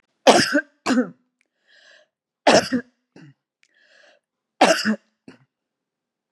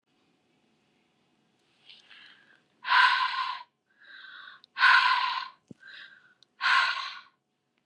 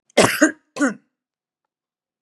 three_cough_length: 6.3 s
three_cough_amplitude: 32768
three_cough_signal_mean_std_ratio: 0.31
exhalation_length: 7.9 s
exhalation_amplitude: 13435
exhalation_signal_mean_std_ratio: 0.38
cough_length: 2.2 s
cough_amplitude: 31774
cough_signal_mean_std_ratio: 0.33
survey_phase: beta (2021-08-13 to 2022-03-07)
age: 65+
gender: Female
wearing_mask: 'No'
symptom_none: true
smoker_status: Ex-smoker
respiratory_condition_asthma: false
respiratory_condition_other: false
recruitment_source: REACT
submission_delay: 6 days
covid_test_result: Negative
covid_test_method: RT-qPCR
influenza_a_test_result: Negative
influenza_b_test_result: Negative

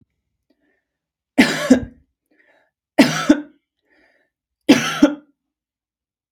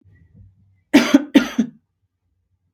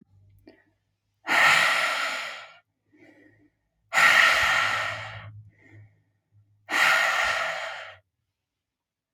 three_cough_length: 6.3 s
three_cough_amplitude: 32768
three_cough_signal_mean_std_ratio: 0.29
cough_length: 2.7 s
cough_amplitude: 32768
cough_signal_mean_std_ratio: 0.29
exhalation_length: 9.1 s
exhalation_amplitude: 19044
exhalation_signal_mean_std_ratio: 0.48
survey_phase: beta (2021-08-13 to 2022-03-07)
age: 18-44
gender: Female
wearing_mask: 'No'
symptom_cough_any: true
symptom_sore_throat: true
symptom_headache: true
symptom_onset: 3 days
smoker_status: Never smoked
respiratory_condition_asthma: false
respiratory_condition_other: false
recruitment_source: Test and Trace
submission_delay: 1 day
covid_test_result: Positive
covid_test_method: RT-qPCR
covid_ct_value: 32.5
covid_ct_gene: N gene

